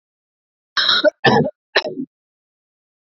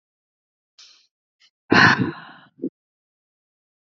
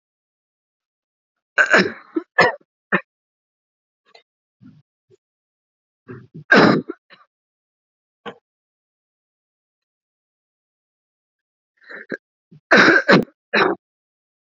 {"cough_length": "3.2 s", "cough_amplitude": 31053, "cough_signal_mean_std_ratio": 0.38, "exhalation_length": "3.9 s", "exhalation_amplitude": 28608, "exhalation_signal_mean_std_ratio": 0.25, "three_cough_length": "14.5 s", "three_cough_amplitude": 30533, "three_cough_signal_mean_std_ratio": 0.26, "survey_phase": "beta (2021-08-13 to 2022-03-07)", "age": "18-44", "gender": "Female", "wearing_mask": "No", "symptom_cough_any": true, "symptom_new_continuous_cough": true, "symptom_sore_throat": true, "symptom_fever_high_temperature": true, "symptom_headache": true, "symptom_change_to_sense_of_smell_or_taste": true, "symptom_onset": "4 days", "smoker_status": "Never smoked", "respiratory_condition_asthma": false, "respiratory_condition_other": false, "recruitment_source": "Test and Trace", "submission_delay": "2 days", "covid_test_result": "Positive", "covid_test_method": "RT-qPCR", "covid_ct_value": 18.6, "covid_ct_gene": "ORF1ab gene", "covid_ct_mean": 19.4, "covid_viral_load": "420000 copies/ml", "covid_viral_load_category": "Low viral load (10K-1M copies/ml)"}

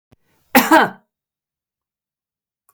{"cough_length": "2.7 s", "cough_amplitude": 32768, "cough_signal_mean_std_ratio": 0.26, "survey_phase": "beta (2021-08-13 to 2022-03-07)", "age": "45-64", "gender": "Female", "wearing_mask": "No", "symptom_none": true, "smoker_status": "Never smoked", "respiratory_condition_asthma": false, "respiratory_condition_other": false, "recruitment_source": "REACT", "submission_delay": "1 day", "covid_test_result": "Negative", "covid_test_method": "RT-qPCR", "influenza_a_test_result": "Negative", "influenza_b_test_result": "Negative"}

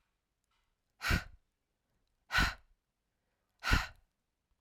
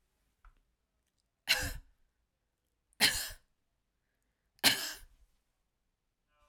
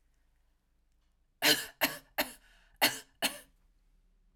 {"exhalation_length": "4.6 s", "exhalation_amplitude": 8445, "exhalation_signal_mean_std_ratio": 0.28, "three_cough_length": "6.5 s", "three_cough_amplitude": 10554, "three_cough_signal_mean_std_ratio": 0.25, "cough_length": "4.4 s", "cough_amplitude": 8677, "cough_signal_mean_std_ratio": 0.29, "survey_phase": "alpha (2021-03-01 to 2021-08-12)", "age": "45-64", "gender": "Female", "wearing_mask": "No", "symptom_none": true, "smoker_status": "Never smoked", "respiratory_condition_asthma": false, "respiratory_condition_other": false, "recruitment_source": "REACT", "submission_delay": "2 days", "covid_test_result": "Negative", "covid_test_method": "RT-qPCR"}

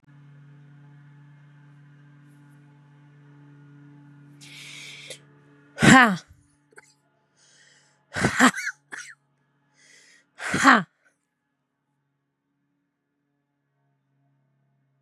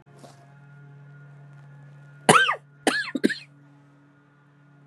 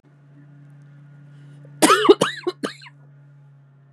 {"exhalation_length": "15.0 s", "exhalation_amplitude": 32226, "exhalation_signal_mean_std_ratio": 0.22, "cough_length": "4.9 s", "cough_amplitude": 29690, "cough_signal_mean_std_ratio": 0.3, "three_cough_length": "3.9 s", "three_cough_amplitude": 32731, "three_cough_signal_mean_std_ratio": 0.3, "survey_phase": "beta (2021-08-13 to 2022-03-07)", "age": "45-64", "gender": "Female", "wearing_mask": "No", "symptom_cough_any": true, "symptom_sore_throat": true, "symptom_diarrhoea": true, "symptom_fatigue": true, "symptom_headache": true, "smoker_status": "Never smoked", "respiratory_condition_asthma": false, "respiratory_condition_other": false, "recruitment_source": "Test and Trace", "submission_delay": "0 days", "covid_test_result": "Positive", "covid_test_method": "LFT"}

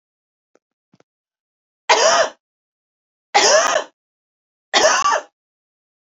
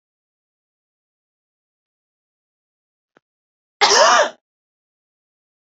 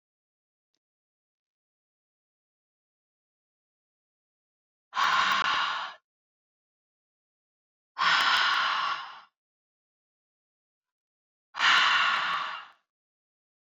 {"three_cough_length": "6.1 s", "three_cough_amplitude": 32714, "three_cough_signal_mean_std_ratio": 0.38, "cough_length": "5.7 s", "cough_amplitude": 29366, "cough_signal_mean_std_ratio": 0.23, "exhalation_length": "13.7 s", "exhalation_amplitude": 11425, "exhalation_signal_mean_std_ratio": 0.38, "survey_phase": "beta (2021-08-13 to 2022-03-07)", "age": "45-64", "gender": "Female", "wearing_mask": "No", "symptom_none": true, "smoker_status": "Never smoked", "respiratory_condition_asthma": false, "respiratory_condition_other": false, "recruitment_source": "REACT", "submission_delay": "1 day", "covid_test_result": "Negative", "covid_test_method": "RT-qPCR", "influenza_a_test_result": "Negative", "influenza_b_test_result": "Negative"}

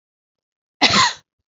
{"cough_length": "1.5 s", "cough_amplitude": 31798, "cough_signal_mean_std_ratio": 0.35, "survey_phase": "beta (2021-08-13 to 2022-03-07)", "age": "45-64", "gender": "Female", "wearing_mask": "No", "symptom_none": true, "smoker_status": "Never smoked", "respiratory_condition_asthma": false, "respiratory_condition_other": false, "recruitment_source": "REACT", "submission_delay": "10 days", "covid_test_result": "Negative", "covid_test_method": "RT-qPCR"}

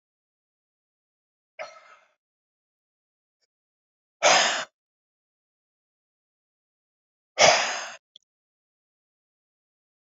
{"exhalation_length": "10.2 s", "exhalation_amplitude": 22057, "exhalation_signal_mean_std_ratio": 0.21, "survey_phase": "beta (2021-08-13 to 2022-03-07)", "age": "65+", "gender": "Male", "wearing_mask": "No", "symptom_cough_any": true, "symptom_runny_or_blocked_nose": true, "symptom_headache": true, "smoker_status": "Ex-smoker", "respiratory_condition_asthma": false, "respiratory_condition_other": false, "recruitment_source": "Test and Trace", "submission_delay": "1 day", "covid_test_result": "Positive", "covid_test_method": "RT-qPCR", "covid_ct_value": 26.9, "covid_ct_gene": "ORF1ab gene"}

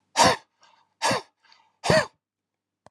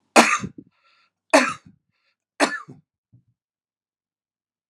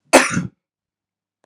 {"exhalation_length": "2.9 s", "exhalation_amplitude": 20692, "exhalation_signal_mean_std_ratio": 0.34, "three_cough_length": "4.7 s", "three_cough_amplitude": 32767, "three_cough_signal_mean_std_ratio": 0.25, "cough_length": "1.5 s", "cough_amplitude": 32768, "cough_signal_mean_std_ratio": 0.3, "survey_phase": "beta (2021-08-13 to 2022-03-07)", "age": "65+", "gender": "Male", "wearing_mask": "No", "symptom_none": true, "smoker_status": "Ex-smoker", "respiratory_condition_asthma": false, "respiratory_condition_other": false, "recruitment_source": "REACT", "submission_delay": "1 day", "covid_test_result": "Negative", "covid_test_method": "RT-qPCR", "influenza_a_test_result": "Negative", "influenza_b_test_result": "Negative"}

